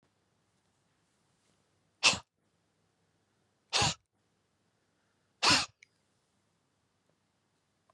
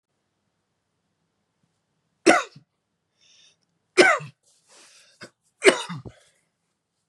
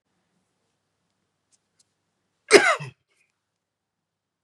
{"exhalation_length": "7.9 s", "exhalation_amplitude": 10063, "exhalation_signal_mean_std_ratio": 0.21, "three_cough_length": "7.1 s", "three_cough_amplitude": 31915, "three_cough_signal_mean_std_ratio": 0.21, "cough_length": "4.4 s", "cough_amplitude": 32700, "cough_signal_mean_std_ratio": 0.17, "survey_phase": "beta (2021-08-13 to 2022-03-07)", "age": "45-64", "gender": "Male", "wearing_mask": "No", "symptom_none": true, "smoker_status": "Never smoked", "respiratory_condition_asthma": true, "respiratory_condition_other": false, "recruitment_source": "REACT", "submission_delay": "2 days", "covid_test_result": "Negative", "covid_test_method": "RT-qPCR", "influenza_a_test_result": "Negative", "influenza_b_test_result": "Negative"}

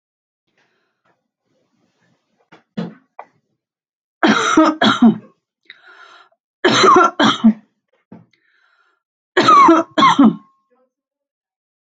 {"three_cough_length": "11.9 s", "three_cough_amplitude": 31611, "three_cough_signal_mean_std_ratio": 0.37, "survey_phase": "alpha (2021-03-01 to 2021-08-12)", "age": "45-64", "gender": "Female", "wearing_mask": "No", "symptom_none": true, "smoker_status": "Never smoked", "respiratory_condition_asthma": false, "respiratory_condition_other": false, "recruitment_source": "REACT", "submission_delay": "0 days", "covid_test_result": "Negative", "covid_test_method": "RT-qPCR"}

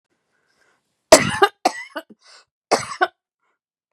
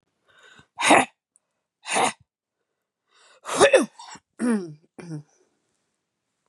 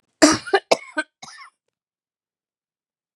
{"three_cough_length": "3.9 s", "three_cough_amplitude": 32768, "three_cough_signal_mean_std_ratio": 0.25, "exhalation_length": "6.5 s", "exhalation_amplitude": 26289, "exhalation_signal_mean_std_ratio": 0.31, "cough_length": "3.2 s", "cough_amplitude": 32767, "cough_signal_mean_std_ratio": 0.24, "survey_phase": "beta (2021-08-13 to 2022-03-07)", "age": "45-64", "gender": "Female", "wearing_mask": "No", "symptom_diarrhoea": true, "symptom_fatigue": true, "symptom_headache": true, "symptom_onset": "4 days", "smoker_status": "Never smoked", "respiratory_condition_asthma": false, "respiratory_condition_other": false, "recruitment_source": "Test and Trace", "submission_delay": "2 days", "covid_test_result": "Positive", "covid_test_method": "ePCR"}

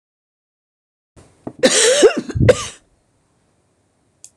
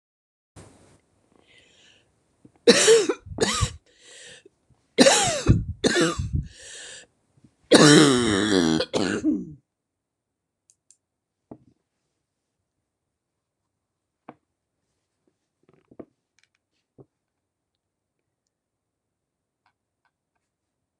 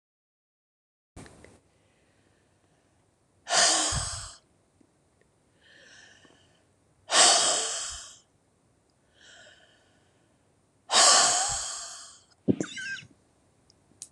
{"cough_length": "4.4 s", "cough_amplitude": 26028, "cough_signal_mean_std_ratio": 0.35, "three_cough_length": "21.0 s", "three_cough_amplitude": 26028, "three_cough_signal_mean_std_ratio": 0.3, "exhalation_length": "14.1 s", "exhalation_amplitude": 19821, "exhalation_signal_mean_std_ratio": 0.33, "survey_phase": "alpha (2021-03-01 to 2021-08-12)", "age": "65+", "gender": "Female", "wearing_mask": "No", "symptom_none": true, "smoker_status": "Never smoked", "respiratory_condition_asthma": false, "respiratory_condition_other": false, "recruitment_source": "REACT", "submission_delay": "1 day", "covid_test_result": "Negative", "covid_test_method": "RT-qPCR"}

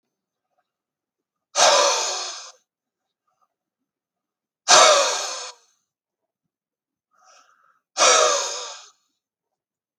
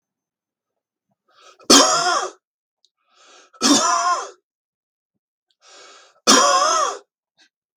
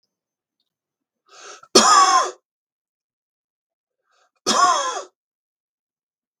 {"exhalation_length": "10.0 s", "exhalation_amplitude": 32287, "exhalation_signal_mean_std_ratio": 0.34, "three_cough_length": "7.8 s", "three_cough_amplitude": 32768, "three_cough_signal_mean_std_ratio": 0.39, "cough_length": "6.4 s", "cough_amplitude": 32768, "cough_signal_mean_std_ratio": 0.32, "survey_phase": "beta (2021-08-13 to 2022-03-07)", "age": "45-64", "gender": "Male", "wearing_mask": "No", "symptom_none": true, "smoker_status": "Never smoked", "respiratory_condition_asthma": true, "respiratory_condition_other": false, "recruitment_source": "REACT", "submission_delay": "-1 day", "covid_test_result": "Negative", "covid_test_method": "RT-qPCR", "influenza_a_test_result": "Negative", "influenza_b_test_result": "Negative"}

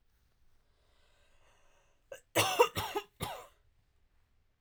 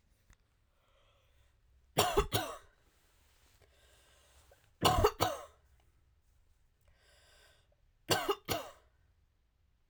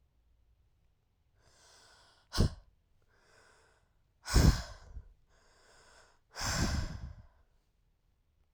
{"cough_length": "4.6 s", "cough_amplitude": 8820, "cough_signal_mean_std_ratio": 0.27, "three_cough_length": "9.9 s", "three_cough_amplitude": 9540, "three_cough_signal_mean_std_ratio": 0.29, "exhalation_length": "8.5 s", "exhalation_amplitude": 7691, "exhalation_signal_mean_std_ratio": 0.27, "survey_phase": "alpha (2021-03-01 to 2021-08-12)", "age": "18-44", "gender": "Female", "wearing_mask": "No", "symptom_cough_any": true, "symptom_new_continuous_cough": true, "symptom_fatigue": true, "symptom_onset": "2 days", "smoker_status": "Ex-smoker", "respiratory_condition_asthma": false, "respiratory_condition_other": false, "recruitment_source": "Test and Trace", "submission_delay": "1 day", "covid_test_result": "Positive", "covid_test_method": "RT-qPCR"}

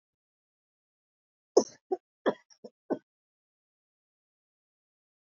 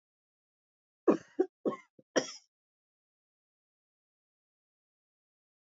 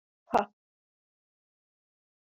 {"cough_length": "5.4 s", "cough_amplitude": 13663, "cough_signal_mean_std_ratio": 0.14, "three_cough_length": "5.7 s", "three_cough_amplitude": 6601, "three_cough_signal_mean_std_ratio": 0.18, "exhalation_length": "2.3 s", "exhalation_amplitude": 9685, "exhalation_signal_mean_std_ratio": 0.14, "survey_phase": "beta (2021-08-13 to 2022-03-07)", "age": "65+", "gender": "Female", "wearing_mask": "No", "symptom_none": true, "smoker_status": "Never smoked", "respiratory_condition_asthma": false, "respiratory_condition_other": false, "recruitment_source": "REACT", "submission_delay": "2 days", "covid_test_result": "Negative", "covid_test_method": "RT-qPCR", "influenza_a_test_result": "Negative", "influenza_b_test_result": "Negative"}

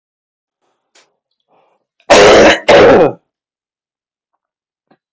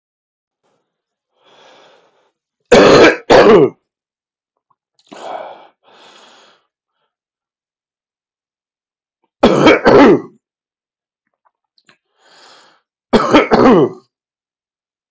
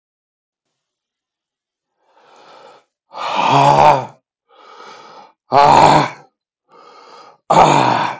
{"cough_length": "5.1 s", "cough_amplitude": 32768, "cough_signal_mean_std_ratio": 0.39, "three_cough_length": "15.1 s", "three_cough_amplitude": 32768, "three_cough_signal_mean_std_ratio": 0.33, "exhalation_length": "8.2 s", "exhalation_amplitude": 32768, "exhalation_signal_mean_std_ratio": 0.4, "survey_phase": "beta (2021-08-13 to 2022-03-07)", "age": "45-64", "gender": "Male", "wearing_mask": "No", "symptom_runny_or_blocked_nose": true, "symptom_diarrhoea": true, "symptom_fatigue": true, "symptom_change_to_sense_of_smell_or_taste": true, "symptom_loss_of_taste": true, "smoker_status": "Current smoker (1 to 10 cigarettes per day)", "respiratory_condition_asthma": false, "respiratory_condition_other": true, "recruitment_source": "Test and Trace", "submission_delay": "1 day", "covid_test_result": "Positive", "covid_test_method": "RT-qPCR", "covid_ct_value": 16.3, "covid_ct_gene": "ORF1ab gene", "covid_ct_mean": 16.8, "covid_viral_load": "3200000 copies/ml", "covid_viral_load_category": "High viral load (>1M copies/ml)"}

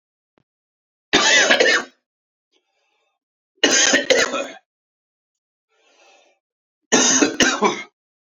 {"three_cough_length": "8.4 s", "three_cough_amplitude": 32768, "three_cough_signal_mean_std_ratio": 0.41, "survey_phase": "beta (2021-08-13 to 2022-03-07)", "age": "45-64", "gender": "Male", "wearing_mask": "No", "symptom_cough_any": true, "symptom_new_continuous_cough": true, "symptom_runny_or_blocked_nose": true, "symptom_fatigue": true, "symptom_headache": true, "smoker_status": "Ex-smoker", "respiratory_condition_asthma": false, "respiratory_condition_other": false, "recruitment_source": "Test and Trace", "submission_delay": "2 days", "covid_test_result": "Positive", "covid_test_method": "RT-qPCR", "covid_ct_value": 17.4, "covid_ct_gene": "ORF1ab gene", "covid_ct_mean": 18.1, "covid_viral_load": "1200000 copies/ml", "covid_viral_load_category": "High viral load (>1M copies/ml)"}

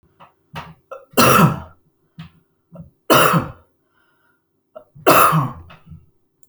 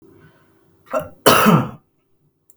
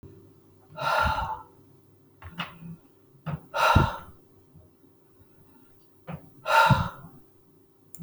{"three_cough_length": "6.5 s", "three_cough_amplitude": 32768, "three_cough_signal_mean_std_ratio": 0.37, "cough_length": "2.6 s", "cough_amplitude": 32768, "cough_signal_mean_std_ratio": 0.36, "exhalation_length": "8.0 s", "exhalation_amplitude": 19803, "exhalation_signal_mean_std_ratio": 0.37, "survey_phase": "alpha (2021-03-01 to 2021-08-12)", "age": "45-64", "gender": "Male", "wearing_mask": "No", "symptom_cough_any": true, "symptom_onset": "12 days", "smoker_status": "Ex-smoker", "respiratory_condition_asthma": true, "respiratory_condition_other": false, "recruitment_source": "REACT", "submission_delay": "1 day", "covid_test_result": "Negative", "covid_test_method": "RT-qPCR"}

